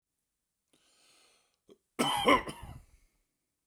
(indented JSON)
{
  "cough_length": "3.7 s",
  "cough_amplitude": 9175,
  "cough_signal_mean_std_ratio": 0.28,
  "survey_phase": "beta (2021-08-13 to 2022-03-07)",
  "age": "45-64",
  "gender": "Male",
  "wearing_mask": "No",
  "symptom_shortness_of_breath": true,
  "symptom_fatigue": true,
  "smoker_status": "Never smoked",
  "respiratory_condition_asthma": false,
  "respiratory_condition_other": false,
  "recruitment_source": "REACT",
  "submission_delay": "1 day",
  "covid_test_result": "Negative",
  "covid_test_method": "RT-qPCR"
}